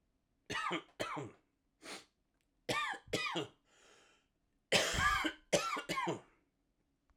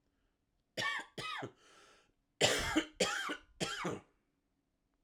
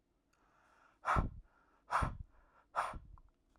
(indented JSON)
{
  "three_cough_length": "7.2 s",
  "three_cough_amplitude": 5441,
  "three_cough_signal_mean_std_ratio": 0.47,
  "cough_length": "5.0 s",
  "cough_amplitude": 5986,
  "cough_signal_mean_std_ratio": 0.45,
  "exhalation_length": "3.6 s",
  "exhalation_amplitude": 3469,
  "exhalation_signal_mean_std_ratio": 0.38,
  "survey_phase": "alpha (2021-03-01 to 2021-08-12)",
  "age": "18-44",
  "gender": "Male",
  "wearing_mask": "No",
  "symptom_cough_any": true,
  "symptom_new_continuous_cough": true,
  "symptom_shortness_of_breath": true,
  "symptom_fatigue": true,
  "symptom_onset": "3 days",
  "smoker_status": "Ex-smoker",
  "respiratory_condition_asthma": false,
  "respiratory_condition_other": false,
  "recruitment_source": "Test and Trace",
  "submission_delay": "1 day",
  "covid_test_result": "Positive",
  "covid_test_method": "RT-qPCR"
}